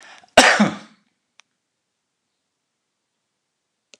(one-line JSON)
{"cough_length": "4.0 s", "cough_amplitude": 29204, "cough_signal_mean_std_ratio": 0.22, "survey_phase": "alpha (2021-03-01 to 2021-08-12)", "age": "45-64", "gender": "Male", "wearing_mask": "No", "symptom_none": true, "smoker_status": "Ex-smoker", "respiratory_condition_asthma": false, "respiratory_condition_other": false, "recruitment_source": "REACT", "submission_delay": "1 day", "covid_test_result": "Negative", "covid_test_method": "RT-qPCR"}